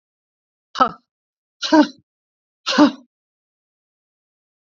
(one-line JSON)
{"exhalation_length": "4.6 s", "exhalation_amplitude": 27615, "exhalation_signal_mean_std_ratio": 0.26, "survey_phase": "beta (2021-08-13 to 2022-03-07)", "age": "45-64", "gender": "Female", "wearing_mask": "No", "symptom_runny_or_blocked_nose": true, "symptom_shortness_of_breath": true, "symptom_sore_throat": true, "symptom_fatigue": true, "symptom_headache": true, "symptom_onset": "3 days", "smoker_status": "Never smoked", "respiratory_condition_asthma": true, "respiratory_condition_other": false, "recruitment_source": "Test and Trace", "submission_delay": "0 days", "covid_test_result": "Positive", "covid_test_method": "RT-qPCR", "covid_ct_value": 18.1, "covid_ct_gene": "N gene"}